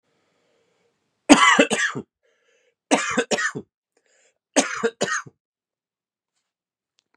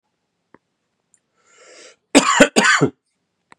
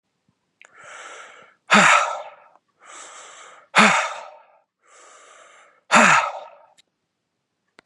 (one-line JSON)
{"three_cough_length": "7.2 s", "three_cough_amplitude": 32767, "three_cough_signal_mean_std_ratio": 0.32, "cough_length": "3.6 s", "cough_amplitude": 32768, "cough_signal_mean_std_ratio": 0.32, "exhalation_length": "7.9 s", "exhalation_amplitude": 31891, "exhalation_signal_mean_std_ratio": 0.33, "survey_phase": "beta (2021-08-13 to 2022-03-07)", "age": "45-64", "gender": "Male", "wearing_mask": "No", "symptom_cough_any": true, "symptom_runny_or_blocked_nose": true, "symptom_sore_throat": true, "symptom_headache": true, "smoker_status": "Never smoked", "respiratory_condition_asthma": false, "respiratory_condition_other": false, "recruitment_source": "Test and Trace", "submission_delay": "1 day", "covid_test_result": "Positive", "covid_test_method": "RT-qPCR", "covid_ct_value": 21.1, "covid_ct_gene": "ORF1ab gene", "covid_ct_mean": 21.7, "covid_viral_load": "78000 copies/ml", "covid_viral_load_category": "Low viral load (10K-1M copies/ml)"}